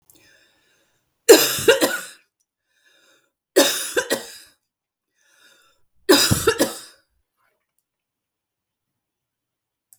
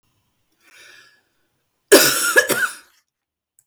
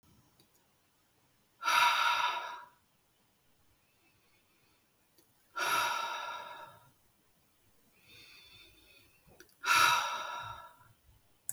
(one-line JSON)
{"three_cough_length": "10.0 s", "three_cough_amplitude": 32768, "three_cough_signal_mean_std_ratio": 0.28, "cough_length": "3.7 s", "cough_amplitude": 32768, "cough_signal_mean_std_ratio": 0.32, "exhalation_length": "11.5 s", "exhalation_amplitude": 7008, "exhalation_signal_mean_std_ratio": 0.38, "survey_phase": "beta (2021-08-13 to 2022-03-07)", "age": "45-64", "gender": "Female", "wearing_mask": "No", "symptom_none": true, "symptom_onset": "12 days", "smoker_status": "Ex-smoker", "respiratory_condition_asthma": false, "respiratory_condition_other": false, "recruitment_source": "REACT", "submission_delay": "1 day", "covid_test_result": "Negative", "covid_test_method": "RT-qPCR", "influenza_a_test_result": "Negative", "influenza_b_test_result": "Negative"}